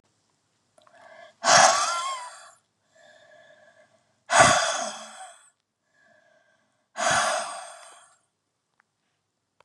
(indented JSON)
{
  "exhalation_length": "9.6 s",
  "exhalation_amplitude": 26808,
  "exhalation_signal_mean_std_ratio": 0.34,
  "survey_phase": "beta (2021-08-13 to 2022-03-07)",
  "age": "45-64",
  "gender": "Female",
  "wearing_mask": "No",
  "symptom_cough_any": true,
  "symptom_new_continuous_cough": true,
  "symptom_fatigue": true,
  "symptom_onset": "13 days",
  "smoker_status": "Never smoked",
  "respiratory_condition_asthma": false,
  "respiratory_condition_other": false,
  "recruitment_source": "REACT",
  "submission_delay": "1 day",
  "covid_test_result": "Negative",
  "covid_test_method": "RT-qPCR",
  "influenza_a_test_result": "Unknown/Void",
  "influenza_b_test_result": "Unknown/Void"
}